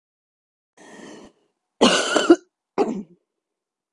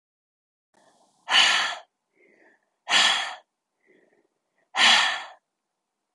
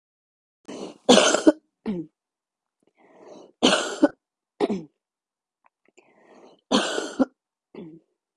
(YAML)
cough_length: 3.9 s
cough_amplitude: 28742
cough_signal_mean_std_ratio: 0.31
exhalation_length: 6.1 s
exhalation_amplitude: 17368
exhalation_signal_mean_std_ratio: 0.36
three_cough_length: 8.4 s
three_cough_amplitude: 28685
three_cough_signal_mean_std_ratio: 0.3
survey_phase: beta (2021-08-13 to 2022-03-07)
age: 45-64
gender: Female
wearing_mask: 'No'
symptom_cough_any: true
symptom_runny_or_blocked_nose: true
symptom_headache: true
symptom_other: true
smoker_status: Ex-smoker
respiratory_condition_asthma: false
respiratory_condition_other: false
recruitment_source: Test and Trace
submission_delay: 2 days
covid_test_result: Positive
covid_test_method: RT-qPCR
covid_ct_value: 23.2
covid_ct_gene: ORF1ab gene